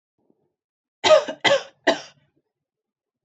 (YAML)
three_cough_length: 3.2 s
three_cough_amplitude: 25856
three_cough_signal_mean_std_ratio: 0.3
survey_phase: beta (2021-08-13 to 2022-03-07)
age: 18-44
gender: Female
wearing_mask: 'No'
symptom_none: true
smoker_status: Never smoked
respiratory_condition_asthma: false
respiratory_condition_other: false
recruitment_source: REACT
submission_delay: 2 days
covid_test_result: Negative
covid_test_method: RT-qPCR
influenza_a_test_result: Negative
influenza_b_test_result: Negative